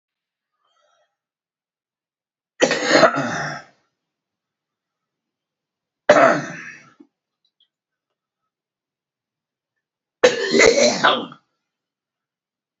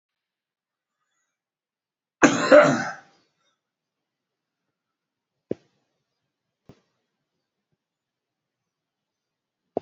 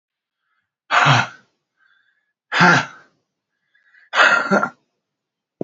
{
  "three_cough_length": "12.8 s",
  "three_cough_amplitude": 32767,
  "three_cough_signal_mean_std_ratio": 0.3,
  "cough_length": "9.8 s",
  "cough_amplitude": 28359,
  "cough_signal_mean_std_ratio": 0.17,
  "exhalation_length": "5.6 s",
  "exhalation_amplitude": 30254,
  "exhalation_signal_mean_std_ratio": 0.36,
  "survey_phase": "alpha (2021-03-01 to 2021-08-12)",
  "age": "65+",
  "gender": "Male",
  "wearing_mask": "No",
  "symptom_none": true,
  "symptom_onset": "12 days",
  "smoker_status": "Current smoker (11 or more cigarettes per day)",
  "respiratory_condition_asthma": true,
  "respiratory_condition_other": false,
  "recruitment_source": "REACT",
  "submission_delay": "2 days",
  "covid_test_result": "Negative",
  "covid_test_method": "RT-qPCR"
}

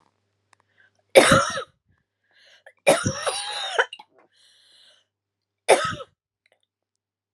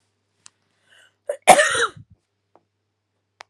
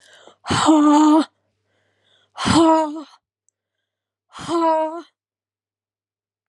{
  "three_cough_length": "7.3 s",
  "three_cough_amplitude": 32768,
  "three_cough_signal_mean_std_ratio": 0.29,
  "cough_length": "3.5 s",
  "cough_amplitude": 32768,
  "cough_signal_mean_std_ratio": 0.24,
  "exhalation_length": "6.5 s",
  "exhalation_amplitude": 23596,
  "exhalation_signal_mean_std_ratio": 0.45,
  "survey_phase": "beta (2021-08-13 to 2022-03-07)",
  "age": "45-64",
  "gender": "Female",
  "wearing_mask": "No",
  "symptom_runny_or_blocked_nose": true,
  "symptom_sore_throat": true,
  "symptom_diarrhoea": true,
  "symptom_fatigue": true,
  "symptom_fever_high_temperature": true,
  "symptom_headache": true,
  "smoker_status": "Ex-smoker",
  "respiratory_condition_asthma": false,
  "respiratory_condition_other": false,
  "recruitment_source": "Test and Trace",
  "submission_delay": "1 day",
  "covid_test_result": "Positive",
  "covid_test_method": "RT-qPCR",
  "covid_ct_value": 18.6,
  "covid_ct_gene": "ORF1ab gene",
  "covid_ct_mean": 18.9,
  "covid_viral_load": "660000 copies/ml",
  "covid_viral_load_category": "Low viral load (10K-1M copies/ml)"
}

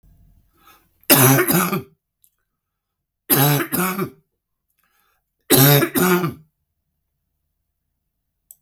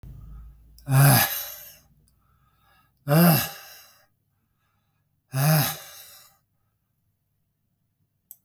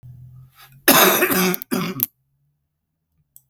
{
  "three_cough_length": "8.6 s",
  "three_cough_amplitude": 32768,
  "three_cough_signal_mean_std_ratio": 0.39,
  "exhalation_length": "8.4 s",
  "exhalation_amplitude": 19477,
  "exhalation_signal_mean_std_ratio": 0.34,
  "cough_length": "3.5 s",
  "cough_amplitude": 32768,
  "cough_signal_mean_std_ratio": 0.41,
  "survey_phase": "beta (2021-08-13 to 2022-03-07)",
  "age": "65+",
  "gender": "Male",
  "wearing_mask": "No",
  "symptom_cough_any": true,
  "symptom_fatigue": true,
  "smoker_status": "Ex-smoker",
  "respiratory_condition_asthma": false,
  "respiratory_condition_other": false,
  "recruitment_source": "Test and Trace",
  "submission_delay": "1 day",
  "covid_test_result": "Positive",
  "covid_test_method": "RT-qPCR"
}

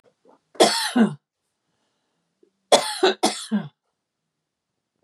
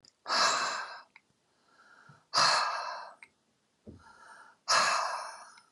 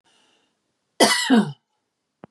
{
  "three_cough_length": "5.0 s",
  "three_cough_amplitude": 32354,
  "three_cough_signal_mean_std_ratio": 0.33,
  "exhalation_length": "5.7 s",
  "exhalation_amplitude": 7390,
  "exhalation_signal_mean_std_ratio": 0.48,
  "cough_length": "2.3 s",
  "cough_amplitude": 28420,
  "cough_signal_mean_std_ratio": 0.35,
  "survey_phase": "beta (2021-08-13 to 2022-03-07)",
  "age": "45-64",
  "gender": "Female",
  "wearing_mask": "No",
  "symptom_none": true,
  "smoker_status": "Ex-smoker",
  "respiratory_condition_asthma": false,
  "respiratory_condition_other": false,
  "recruitment_source": "REACT",
  "submission_delay": "1 day",
  "covid_test_result": "Negative",
  "covid_test_method": "RT-qPCR",
  "influenza_a_test_result": "Negative",
  "influenza_b_test_result": "Negative"
}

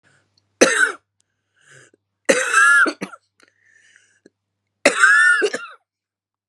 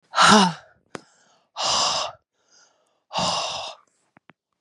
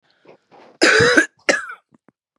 {
  "three_cough_length": "6.5 s",
  "three_cough_amplitude": 32768,
  "three_cough_signal_mean_std_ratio": 0.4,
  "exhalation_length": "4.6 s",
  "exhalation_amplitude": 29098,
  "exhalation_signal_mean_std_ratio": 0.4,
  "cough_length": "2.4 s",
  "cough_amplitude": 32767,
  "cough_signal_mean_std_ratio": 0.41,
  "survey_phase": "beta (2021-08-13 to 2022-03-07)",
  "age": "45-64",
  "gender": "Female",
  "wearing_mask": "No",
  "symptom_cough_any": true,
  "symptom_new_continuous_cough": true,
  "symptom_runny_or_blocked_nose": true,
  "symptom_shortness_of_breath": true,
  "symptom_sore_throat": true,
  "symptom_fatigue": true,
  "symptom_headache": true,
  "smoker_status": "Ex-smoker",
  "respiratory_condition_asthma": false,
  "respiratory_condition_other": false,
  "recruitment_source": "Test and Trace",
  "submission_delay": "2 days",
  "covid_test_result": "Positive",
  "covid_test_method": "LFT"
}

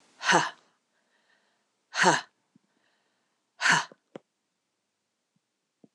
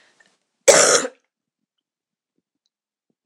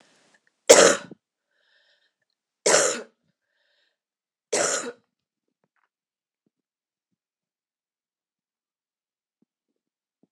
{
  "exhalation_length": "5.9 s",
  "exhalation_amplitude": 18596,
  "exhalation_signal_mean_std_ratio": 0.26,
  "cough_length": "3.3 s",
  "cough_amplitude": 26028,
  "cough_signal_mean_std_ratio": 0.26,
  "three_cough_length": "10.3 s",
  "three_cough_amplitude": 26028,
  "three_cough_signal_mean_std_ratio": 0.2,
  "survey_phase": "alpha (2021-03-01 to 2021-08-12)",
  "age": "45-64",
  "gender": "Female",
  "wearing_mask": "No",
  "symptom_cough_any": true,
  "symptom_fatigue": true,
  "symptom_headache": true,
  "symptom_onset": "3 days",
  "smoker_status": "Never smoked",
  "respiratory_condition_asthma": false,
  "respiratory_condition_other": false,
  "recruitment_source": "Test and Trace",
  "submission_delay": "1 day",
  "covid_test_result": "Positive",
  "covid_test_method": "RT-qPCR"
}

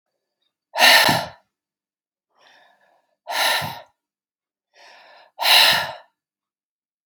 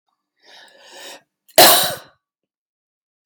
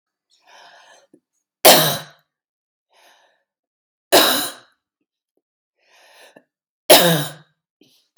{
  "exhalation_length": "7.1 s",
  "exhalation_amplitude": 32767,
  "exhalation_signal_mean_std_ratio": 0.33,
  "cough_length": "3.3 s",
  "cough_amplitude": 32768,
  "cough_signal_mean_std_ratio": 0.27,
  "three_cough_length": "8.2 s",
  "three_cough_amplitude": 32768,
  "three_cough_signal_mean_std_ratio": 0.27,
  "survey_phase": "beta (2021-08-13 to 2022-03-07)",
  "age": "45-64",
  "gender": "Female",
  "wearing_mask": "No",
  "symptom_none": true,
  "smoker_status": "Never smoked",
  "respiratory_condition_asthma": false,
  "respiratory_condition_other": false,
  "recruitment_source": "REACT",
  "submission_delay": "1 day",
  "covid_test_result": "Negative",
  "covid_test_method": "RT-qPCR",
  "influenza_a_test_result": "Negative",
  "influenza_b_test_result": "Negative"
}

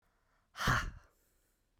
{
  "exhalation_length": "1.8 s",
  "exhalation_amplitude": 3706,
  "exhalation_signal_mean_std_ratio": 0.34,
  "survey_phase": "beta (2021-08-13 to 2022-03-07)",
  "age": "18-44",
  "gender": "Male",
  "wearing_mask": "No",
  "symptom_cough_any": true,
  "symptom_diarrhoea": true,
  "symptom_fatigue": true,
  "symptom_headache": true,
  "symptom_onset": "3 days",
  "smoker_status": "Never smoked",
  "respiratory_condition_asthma": true,
  "respiratory_condition_other": false,
  "recruitment_source": "Test and Trace",
  "submission_delay": "2 days",
  "covid_test_result": "Positive",
  "covid_test_method": "RT-qPCR",
  "covid_ct_value": 19.2,
  "covid_ct_gene": "ORF1ab gene"
}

